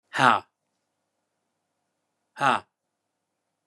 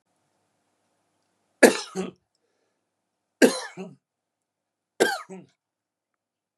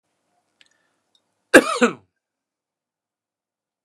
{"exhalation_length": "3.7 s", "exhalation_amplitude": 25538, "exhalation_signal_mean_std_ratio": 0.22, "three_cough_length": "6.6 s", "three_cough_amplitude": 32034, "three_cough_signal_mean_std_ratio": 0.2, "cough_length": "3.8 s", "cough_amplitude": 32768, "cough_signal_mean_std_ratio": 0.18, "survey_phase": "beta (2021-08-13 to 2022-03-07)", "age": "45-64", "gender": "Male", "wearing_mask": "Yes", "symptom_none": true, "smoker_status": "Ex-smoker", "respiratory_condition_asthma": true, "respiratory_condition_other": false, "recruitment_source": "REACT", "submission_delay": "2 days", "covid_test_result": "Negative", "covid_test_method": "RT-qPCR", "influenza_a_test_result": "Negative", "influenza_b_test_result": "Negative"}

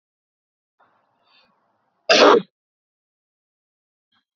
{"cough_length": "4.4 s", "cough_amplitude": 29262, "cough_signal_mean_std_ratio": 0.22, "survey_phase": "beta (2021-08-13 to 2022-03-07)", "age": "18-44", "gender": "Male", "wearing_mask": "No", "symptom_fatigue": true, "symptom_other": true, "smoker_status": "Never smoked", "respiratory_condition_asthma": false, "respiratory_condition_other": false, "recruitment_source": "REACT", "submission_delay": "1 day", "covid_test_result": "Negative", "covid_test_method": "RT-qPCR", "influenza_a_test_result": "Negative", "influenza_b_test_result": "Negative"}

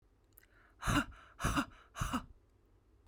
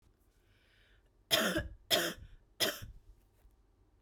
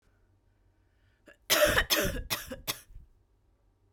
{"exhalation_length": "3.1 s", "exhalation_amplitude": 3721, "exhalation_signal_mean_std_ratio": 0.41, "three_cough_length": "4.0 s", "three_cough_amplitude": 7223, "three_cough_signal_mean_std_ratio": 0.37, "cough_length": "3.9 s", "cough_amplitude": 10993, "cough_signal_mean_std_ratio": 0.38, "survey_phase": "beta (2021-08-13 to 2022-03-07)", "age": "18-44", "gender": "Female", "wearing_mask": "No", "symptom_runny_or_blocked_nose": true, "symptom_onset": "4 days", "smoker_status": "Never smoked", "respiratory_condition_asthma": false, "respiratory_condition_other": false, "recruitment_source": "Test and Trace", "submission_delay": "1 day", "covid_test_result": "Positive", "covid_test_method": "RT-qPCR", "covid_ct_value": 21.9, "covid_ct_gene": "ORF1ab gene", "covid_ct_mean": 22.5, "covid_viral_load": "41000 copies/ml", "covid_viral_load_category": "Low viral load (10K-1M copies/ml)"}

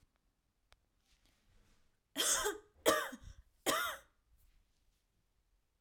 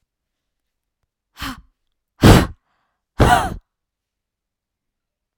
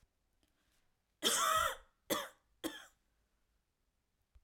{"three_cough_length": "5.8 s", "three_cough_amplitude": 5560, "three_cough_signal_mean_std_ratio": 0.33, "exhalation_length": "5.4 s", "exhalation_amplitude": 32768, "exhalation_signal_mean_std_ratio": 0.25, "cough_length": "4.4 s", "cough_amplitude": 3488, "cough_signal_mean_std_ratio": 0.34, "survey_phase": "alpha (2021-03-01 to 2021-08-12)", "age": "18-44", "gender": "Female", "wearing_mask": "No", "symptom_none": true, "smoker_status": "Never smoked", "respiratory_condition_asthma": true, "respiratory_condition_other": false, "recruitment_source": "REACT", "submission_delay": "1 day", "covid_test_result": "Negative", "covid_test_method": "RT-qPCR"}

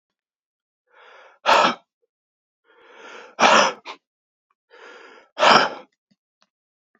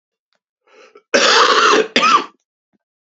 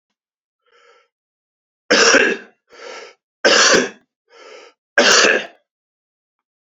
{"exhalation_length": "7.0 s", "exhalation_amplitude": 28891, "exhalation_signal_mean_std_ratio": 0.3, "cough_length": "3.2 s", "cough_amplitude": 32272, "cough_signal_mean_std_ratio": 0.49, "three_cough_length": "6.7 s", "three_cough_amplitude": 31418, "three_cough_signal_mean_std_ratio": 0.38, "survey_phase": "beta (2021-08-13 to 2022-03-07)", "age": "45-64", "gender": "Male", "wearing_mask": "No", "symptom_cough_any": true, "symptom_runny_or_blocked_nose": true, "symptom_sore_throat": true, "symptom_fatigue": true, "symptom_headache": true, "symptom_other": true, "smoker_status": "Never smoked", "respiratory_condition_asthma": false, "respiratory_condition_other": false, "recruitment_source": "Test and Trace", "submission_delay": "2 days", "covid_test_result": "Positive", "covid_test_method": "RT-qPCR", "covid_ct_value": 11.4, "covid_ct_gene": "ORF1ab gene", "covid_ct_mean": 11.8, "covid_viral_load": "130000000 copies/ml", "covid_viral_load_category": "High viral load (>1M copies/ml)"}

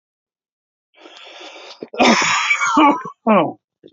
{"cough_length": "3.9 s", "cough_amplitude": 32767, "cough_signal_mean_std_ratio": 0.49, "survey_phase": "alpha (2021-03-01 to 2021-08-12)", "age": "45-64", "gender": "Male", "wearing_mask": "No", "symptom_fatigue": true, "symptom_headache": true, "symptom_onset": "7 days", "smoker_status": "Ex-smoker", "respiratory_condition_asthma": false, "respiratory_condition_other": false, "recruitment_source": "Test and Trace", "submission_delay": "2 days", "covid_test_result": "Positive", "covid_test_method": "RT-qPCR", "covid_ct_value": 14.7, "covid_ct_gene": "N gene", "covid_ct_mean": 14.9, "covid_viral_load": "13000000 copies/ml", "covid_viral_load_category": "High viral load (>1M copies/ml)"}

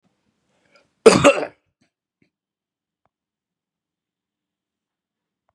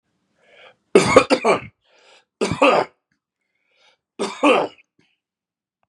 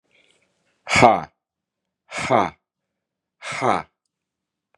{"cough_length": "5.5 s", "cough_amplitude": 32768, "cough_signal_mean_std_ratio": 0.17, "three_cough_length": "5.9 s", "three_cough_amplitude": 32768, "three_cough_signal_mean_std_ratio": 0.34, "exhalation_length": "4.8 s", "exhalation_amplitude": 32768, "exhalation_signal_mean_std_ratio": 0.29, "survey_phase": "beta (2021-08-13 to 2022-03-07)", "age": "45-64", "gender": "Male", "wearing_mask": "No", "symptom_cough_any": true, "symptom_new_continuous_cough": true, "symptom_fatigue": true, "symptom_fever_high_temperature": true, "symptom_headache": true, "symptom_other": true, "symptom_onset": "2 days", "smoker_status": "Never smoked", "respiratory_condition_asthma": false, "respiratory_condition_other": false, "recruitment_source": "Test and Trace", "submission_delay": "1 day", "covid_test_result": "Positive", "covid_test_method": "RT-qPCR", "covid_ct_value": 25.3, "covid_ct_gene": "ORF1ab gene", "covid_ct_mean": 25.5, "covid_viral_load": "4300 copies/ml", "covid_viral_load_category": "Minimal viral load (< 10K copies/ml)"}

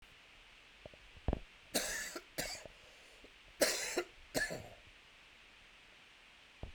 {"cough_length": "6.7 s", "cough_amplitude": 5565, "cough_signal_mean_std_ratio": 0.43, "survey_phase": "alpha (2021-03-01 to 2021-08-12)", "age": "18-44", "gender": "Male", "wearing_mask": "No", "symptom_cough_any": true, "symptom_fatigue": true, "symptom_fever_high_temperature": true, "symptom_headache": true, "symptom_onset": "2 days", "smoker_status": "Never smoked", "respiratory_condition_asthma": false, "respiratory_condition_other": false, "recruitment_source": "Test and Trace", "submission_delay": "1 day", "covid_test_result": "Positive", "covid_test_method": "RT-qPCR"}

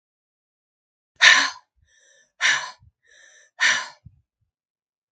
{"exhalation_length": "5.1 s", "exhalation_amplitude": 32767, "exhalation_signal_mean_std_ratio": 0.28, "survey_phase": "beta (2021-08-13 to 2022-03-07)", "age": "45-64", "gender": "Female", "wearing_mask": "No", "symptom_none": true, "smoker_status": "Never smoked", "respiratory_condition_asthma": false, "respiratory_condition_other": false, "recruitment_source": "REACT", "submission_delay": "3 days", "covid_test_result": "Negative", "covid_test_method": "RT-qPCR", "influenza_a_test_result": "Negative", "influenza_b_test_result": "Negative"}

